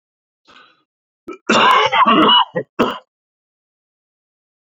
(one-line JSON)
{"cough_length": "4.6 s", "cough_amplitude": 28150, "cough_signal_mean_std_ratio": 0.42, "survey_phase": "beta (2021-08-13 to 2022-03-07)", "age": "18-44", "gender": "Male", "wearing_mask": "No", "symptom_cough_any": true, "symptom_runny_or_blocked_nose": true, "symptom_fatigue": true, "symptom_headache": true, "smoker_status": "Current smoker (11 or more cigarettes per day)", "respiratory_condition_asthma": false, "respiratory_condition_other": false, "recruitment_source": "REACT", "submission_delay": "1 day", "covid_test_result": "Negative", "covid_test_method": "RT-qPCR", "influenza_a_test_result": "Negative", "influenza_b_test_result": "Negative"}